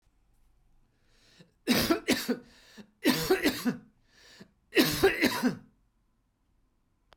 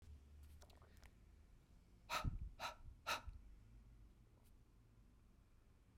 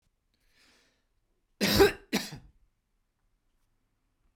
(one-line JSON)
{"three_cough_length": "7.2 s", "three_cough_amplitude": 10710, "three_cough_signal_mean_std_ratio": 0.41, "exhalation_length": "6.0 s", "exhalation_amplitude": 1006, "exhalation_signal_mean_std_ratio": 0.48, "cough_length": "4.4 s", "cough_amplitude": 13133, "cough_signal_mean_std_ratio": 0.24, "survey_phase": "beta (2021-08-13 to 2022-03-07)", "age": "45-64", "gender": "Male", "wearing_mask": "No", "symptom_none": true, "smoker_status": "Never smoked", "respiratory_condition_asthma": false, "respiratory_condition_other": false, "recruitment_source": "REACT", "submission_delay": "2 days", "covid_test_result": "Negative", "covid_test_method": "RT-qPCR"}